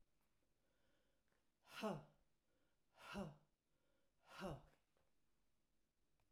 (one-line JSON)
{"exhalation_length": "6.3 s", "exhalation_amplitude": 571, "exhalation_signal_mean_std_ratio": 0.33, "survey_phase": "alpha (2021-03-01 to 2021-08-12)", "age": "65+", "gender": "Female", "wearing_mask": "No", "symptom_none": true, "smoker_status": "Ex-smoker", "respiratory_condition_asthma": false, "respiratory_condition_other": false, "recruitment_source": "REACT", "submission_delay": "2 days", "covid_test_result": "Negative", "covid_test_method": "RT-qPCR"}